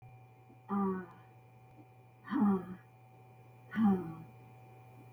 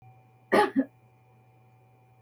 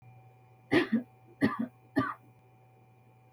{
  "exhalation_length": "5.1 s",
  "exhalation_amplitude": 3417,
  "exhalation_signal_mean_std_ratio": 0.45,
  "cough_length": "2.2 s",
  "cough_amplitude": 11567,
  "cough_signal_mean_std_ratio": 0.29,
  "three_cough_length": "3.3 s",
  "three_cough_amplitude": 7138,
  "three_cough_signal_mean_std_ratio": 0.37,
  "survey_phase": "beta (2021-08-13 to 2022-03-07)",
  "age": "45-64",
  "gender": "Female",
  "wearing_mask": "No",
  "symptom_none": true,
  "smoker_status": "Never smoked",
  "respiratory_condition_asthma": true,
  "respiratory_condition_other": false,
  "recruitment_source": "REACT",
  "submission_delay": "2 days",
  "covid_test_result": "Negative",
  "covid_test_method": "RT-qPCR",
  "influenza_a_test_result": "Negative",
  "influenza_b_test_result": "Negative"
}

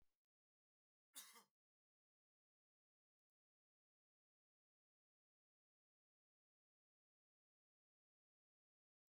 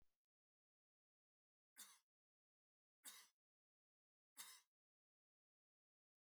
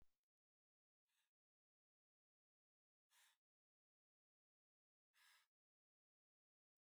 {
  "cough_length": "9.1 s",
  "cough_amplitude": 258,
  "cough_signal_mean_std_ratio": 0.12,
  "three_cough_length": "6.2 s",
  "three_cough_amplitude": 238,
  "three_cough_signal_mean_std_ratio": 0.24,
  "exhalation_length": "6.8 s",
  "exhalation_amplitude": 25,
  "exhalation_signal_mean_std_ratio": 0.24,
  "survey_phase": "alpha (2021-03-01 to 2021-08-12)",
  "age": "45-64",
  "gender": "Male",
  "wearing_mask": "No",
  "symptom_none": true,
  "smoker_status": "Never smoked",
  "respiratory_condition_asthma": false,
  "respiratory_condition_other": false,
  "recruitment_source": "REACT",
  "submission_delay": "1 day",
  "covid_test_result": "Negative",
  "covid_test_method": "RT-qPCR"
}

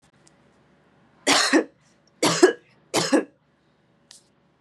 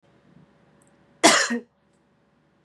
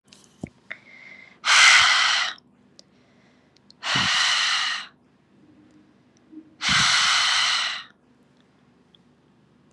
{
  "three_cough_length": "4.6 s",
  "three_cough_amplitude": 27035,
  "three_cough_signal_mean_std_ratio": 0.34,
  "cough_length": "2.6 s",
  "cough_amplitude": 28767,
  "cough_signal_mean_std_ratio": 0.27,
  "exhalation_length": "9.7 s",
  "exhalation_amplitude": 29208,
  "exhalation_signal_mean_std_ratio": 0.46,
  "survey_phase": "beta (2021-08-13 to 2022-03-07)",
  "age": "18-44",
  "gender": "Female",
  "wearing_mask": "No",
  "symptom_runny_or_blocked_nose": true,
  "smoker_status": "Never smoked",
  "respiratory_condition_asthma": false,
  "respiratory_condition_other": false,
  "recruitment_source": "Test and Trace",
  "submission_delay": "1 day",
  "covid_test_result": "Positive",
  "covid_test_method": "RT-qPCR",
  "covid_ct_value": 21.8,
  "covid_ct_gene": "N gene"
}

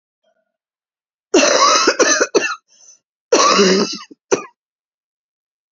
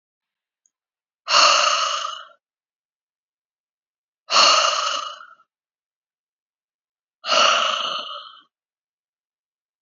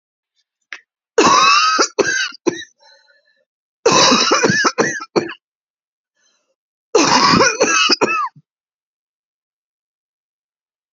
{
  "cough_length": "5.7 s",
  "cough_amplitude": 32768,
  "cough_signal_mean_std_ratio": 0.46,
  "exhalation_length": "9.8 s",
  "exhalation_amplitude": 26373,
  "exhalation_signal_mean_std_ratio": 0.38,
  "three_cough_length": "10.9 s",
  "three_cough_amplitude": 32768,
  "three_cough_signal_mean_std_ratio": 0.47,
  "survey_phase": "beta (2021-08-13 to 2022-03-07)",
  "age": "18-44",
  "gender": "Female",
  "wearing_mask": "No",
  "symptom_cough_any": true,
  "symptom_sore_throat": true,
  "symptom_abdominal_pain": true,
  "symptom_fatigue": true,
  "symptom_headache": true,
  "symptom_loss_of_taste": true,
  "symptom_onset": "8 days",
  "smoker_status": "Ex-smoker",
  "respiratory_condition_asthma": false,
  "respiratory_condition_other": false,
  "recruitment_source": "Test and Trace",
  "submission_delay": "2 days",
  "covid_test_result": "Positive",
  "covid_test_method": "RT-qPCR",
  "covid_ct_value": 22.1,
  "covid_ct_gene": "N gene",
  "covid_ct_mean": 22.3,
  "covid_viral_load": "49000 copies/ml",
  "covid_viral_load_category": "Low viral load (10K-1M copies/ml)"
}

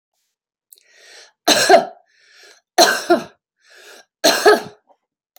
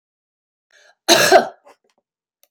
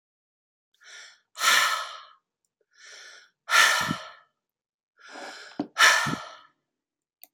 {
  "three_cough_length": "5.4 s",
  "three_cough_amplitude": 30263,
  "three_cough_signal_mean_std_ratio": 0.35,
  "cough_length": "2.5 s",
  "cough_amplitude": 31975,
  "cough_signal_mean_std_ratio": 0.3,
  "exhalation_length": "7.3 s",
  "exhalation_amplitude": 20604,
  "exhalation_signal_mean_std_ratio": 0.35,
  "survey_phase": "beta (2021-08-13 to 2022-03-07)",
  "age": "45-64",
  "gender": "Female",
  "wearing_mask": "No",
  "symptom_none": true,
  "smoker_status": "Ex-smoker",
  "respiratory_condition_asthma": false,
  "respiratory_condition_other": false,
  "recruitment_source": "REACT",
  "submission_delay": "1 day",
  "covid_test_result": "Negative",
  "covid_test_method": "RT-qPCR",
  "influenza_a_test_result": "Negative",
  "influenza_b_test_result": "Negative"
}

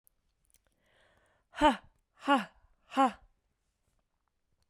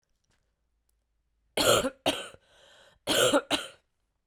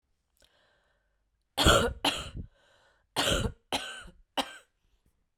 {
  "exhalation_length": "4.7 s",
  "exhalation_amplitude": 8037,
  "exhalation_signal_mean_std_ratio": 0.25,
  "cough_length": "4.3 s",
  "cough_amplitude": 10660,
  "cough_signal_mean_std_ratio": 0.37,
  "three_cough_length": "5.4 s",
  "three_cough_amplitude": 13990,
  "three_cough_signal_mean_std_ratio": 0.35,
  "survey_phase": "beta (2021-08-13 to 2022-03-07)",
  "age": "18-44",
  "gender": "Female",
  "wearing_mask": "No",
  "symptom_cough_any": true,
  "symptom_runny_or_blocked_nose": true,
  "symptom_sore_throat": true,
  "symptom_fatigue": true,
  "symptom_fever_high_temperature": true,
  "symptom_headache": true,
  "symptom_change_to_sense_of_smell_or_taste": true,
  "symptom_loss_of_taste": true,
  "smoker_status": "Prefer not to say",
  "respiratory_condition_asthma": false,
  "respiratory_condition_other": false,
  "recruitment_source": "Test and Trace",
  "submission_delay": "2 days",
  "covid_test_result": "Positive",
  "covid_test_method": "RT-qPCR",
  "covid_ct_value": 24.5,
  "covid_ct_gene": "ORF1ab gene",
  "covid_ct_mean": 25.2,
  "covid_viral_load": "5300 copies/ml",
  "covid_viral_load_category": "Minimal viral load (< 10K copies/ml)"
}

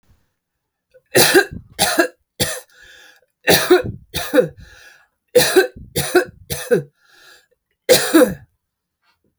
{
  "cough_length": "9.4 s",
  "cough_amplitude": 32768,
  "cough_signal_mean_std_ratio": 0.4,
  "survey_phase": "alpha (2021-03-01 to 2021-08-12)",
  "age": "45-64",
  "gender": "Female",
  "wearing_mask": "No",
  "symptom_none": true,
  "smoker_status": "Current smoker (1 to 10 cigarettes per day)",
  "respiratory_condition_asthma": false,
  "respiratory_condition_other": false,
  "recruitment_source": "REACT",
  "submission_delay": "2 days",
  "covid_test_result": "Negative",
  "covid_test_method": "RT-qPCR"
}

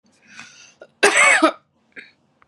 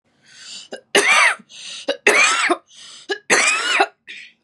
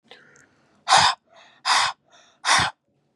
{
  "cough_length": "2.5 s",
  "cough_amplitude": 32651,
  "cough_signal_mean_std_ratio": 0.37,
  "three_cough_length": "4.4 s",
  "three_cough_amplitude": 32290,
  "three_cough_signal_mean_std_ratio": 0.54,
  "exhalation_length": "3.2 s",
  "exhalation_amplitude": 26452,
  "exhalation_signal_mean_std_ratio": 0.4,
  "survey_phase": "beta (2021-08-13 to 2022-03-07)",
  "age": "18-44",
  "gender": "Female",
  "wearing_mask": "No",
  "symptom_none": true,
  "symptom_onset": "8 days",
  "smoker_status": "Current smoker (e-cigarettes or vapes only)",
  "respiratory_condition_asthma": false,
  "respiratory_condition_other": false,
  "recruitment_source": "REACT",
  "submission_delay": "1 day",
  "covid_test_result": "Negative",
  "covid_test_method": "RT-qPCR",
  "influenza_a_test_result": "Negative",
  "influenza_b_test_result": "Negative"
}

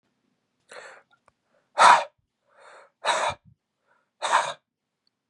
{
  "exhalation_length": "5.3 s",
  "exhalation_amplitude": 29542,
  "exhalation_signal_mean_std_ratio": 0.27,
  "survey_phase": "beta (2021-08-13 to 2022-03-07)",
  "age": "18-44",
  "gender": "Male",
  "wearing_mask": "No",
  "symptom_runny_or_blocked_nose": true,
  "symptom_sore_throat": true,
  "symptom_fatigue": true,
  "symptom_headache": true,
  "symptom_other": true,
  "smoker_status": "Never smoked",
  "respiratory_condition_asthma": true,
  "respiratory_condition_other": false,
  "recruitment_source": "Test and Trace",
  "submission_delay": "1 day",
  "covid_test_result": "Positive",
  "covid_test_method": "RT-qPCR"
}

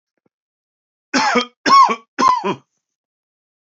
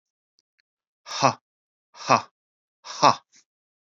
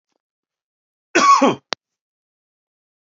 {
  "three_cough_length": "3.8 s",
  "three_cough_amplitude": 29111,
  "three_cough_signal_mean_std_ratio": 0.39,
  "exhalation_length": "3.9 s",
  "exhalation_amplitude": 29658,
  "exhalation_signal_mean_std_ratio": 0.23,
  "cough_length": "3.1 s",
  "cough_amplitude": 27690,
  "cough_signal_mean_std_ratio": 0.28,
  "survey_phase": "beta (2021-08-13 to 2022-03-07)",
  "age": "45-64",
  "gender": "Male",
  "wearing_mask": "No",
  "symptom_cough_any": true,
  "symptom_runny_or_blocked_nose": true,
  "symptom_sore_throat": true,
  "symptom_headache": true,
  "smoker_status": "Never smoked",
  "respiratory_condition_asthma": false,
  "respiratory_condition_other": false,
  "recruitment_source": "Test and Trace",
  "submission_delay": "2 days",
  "covid_test_result": "Positive",
  "covid_test_method": "ePCR"
}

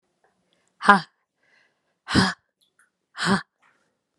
{
  "exhalation_length": "4.2 s",
  "exhalation_amplitude": 32767,
  "exhalation_signal_mean_std_ratio": 0.25,
  "survey_phase": "beta (2021-08-13 to 2022-03-07)",
  "age": "18-44",
  "gender": "Female",
  "wearing_mask": "No",
  "symptom_runny_or_blocked_nose": true,
  "symptom_fatigue": true,
  "symptom_headache": true,
  "symptom_onset": "3 days",
  "smoker_status": "Never smoked",
  "respiratory_condition_asthma": false,
  "respiratory_condition_other": false,
  "recruitment_source": "Test and Trace",
  "submission_delay": "1 day",
  "covid_test_result": "Positive",
  "covid_test_method": "ePCR"
}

